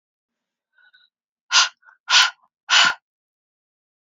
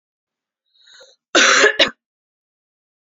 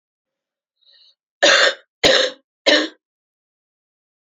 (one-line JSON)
{"exhalation_length": "4.1 s", "exhalation_amplitude": 30260, "exhalation_signal_mean_std_ratio": 0.3, "cough_length": "3.1 s", "cough_amplitude": 32767, "cough_signal_mean_std_ratio": 0.32, "three_cough_length": "4.4 s", "three_cough_amplitude": 29621, "three_cough_signal_mean_std_ratio": 0.34, "survey_phase": "beta (2021-08-13 to 2022-03-07)", "age": "18-44", "gender": "Female", "wearing_mask": "No", "symptom_cough_any": true, "symptom_runny_or_blocked_nose": true, "symptom_sore_throat": true, "symptom_fatigue": true, "symptom_change_to_sense_of_smell_or_taste": true, "symptom_onset": "4 days", "smoker_status": "Never smoked", "respiratory_condition_asthma": false, "respiratory_condition_other": false, "recruitment_source": "Test and Trace", "submission_delay": "2 days", "covid_test_result": "Positive", "covid_test_method": "RT-qPCR", "covid_ct_value": 9.8, "covid_ct_gene": "ORF1ab gene"}